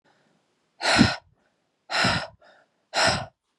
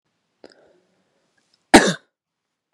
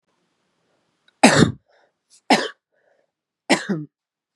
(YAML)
exhalation_length: 3.6 s
exhalation_amplitude: 25023
exhalation_signal_mean_std_ratio: 0.4
cough_length: 2.7 s
cough_amplitude: 32768
cough_signal_mean_std_ratio: 0.18
three_cough_length: 4.4 s
three_cough_amplitude: 32768
three_cough_signal_mean_std_ratio: 0.27
survey_phase: beta (2021-08-13 to 2022-03-07)
age: 18-44
gender: Female
wearing_mask: 'No'
symptom_runny_or_blocked_nose: true
symptom_fatigue: true
symptom_onset: 12 days
smoker_status: Never smoked
respiratory_condition_asthma: false
respiratory_condition_other: false
recruitment_source: REACT
submission_delay: 2 days
covid_test_result: Positive
covid_test_method: RT-qPCR
covid_ct_value: 36.0
covid_ct_gene: N gene
influenza_a_test_result: Negative
influenza_b_test_result: Negative